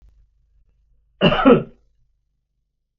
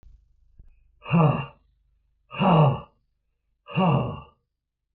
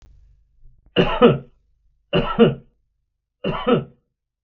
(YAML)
cough_length: 3.0 s
cough_amplitude: 32766
cough_signal_mean_std_ratio: 0.28
exhalation_length: 4.9 s
exhalation_amplitude: 16365
exhalation_signal_mean_std_ratio: 0.41
three_cough_length: 4.4 s
three_cough_amplitude: 32766
three_cough_signal_mean_std_ratio: 0.37
survey_phase: beta (2021-08-13 to 2022-03-07)
age: 65+
gender: Male
wearing_mask: 'No'
symptom_none: true
smoker_status: Ex-smoker
respiratory_condition_asthma: false
respiratory_condition_other: false
recruitment_source: REACT
submission_delay: 3 days
covid_test_result: Negative
covid_test_method: RT-qPCR
influenza_a_test_result: Negative
influenza_b_test_result: Negative